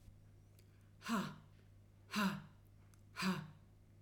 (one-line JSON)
{"exhalation_length": "4.0 s", "exhalation_amplitude": 1722, "exhalation_signal_mean_std_ratio": 0.47, "survey_phase": "alpha (2021-03-01 to 2021-08-12)", "age": "45-64", "gender": "Female", "wearing_mask": "No", "symptom_none": true, "smoker_status": "Never smoked", "respiratory_condition_asthma": false, "respiratory_condition_other": false, "recruitment_source": "REACT", "submission_delay": "1 day", "covid_test_result": "Negative", "covid_test_method": "RT-qPCR"}